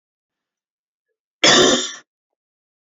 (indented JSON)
{
  "cough_length": "3.0 s",
  "cough_amplitude": 32673,
  "cough_signal_mean_std_ratio": 0.31,
  "survey_phase": "alpha (2021-03-01 to 2021-08-12)",
  "age": "45-64",
  "gender": "Female",
  "wearing_mask": "No",
  "symptom_none": true,
  "smoker_status": "Ex-smoker",
  "respiratory_condition_asthma": false,
  "respiratory_condition_other": false,
  "recruitment_source": "REACT",
  "submission_delay": "7 days",
  "covid_test_result": "Negative",
  "covid_test_method": "RT-qPCR"
}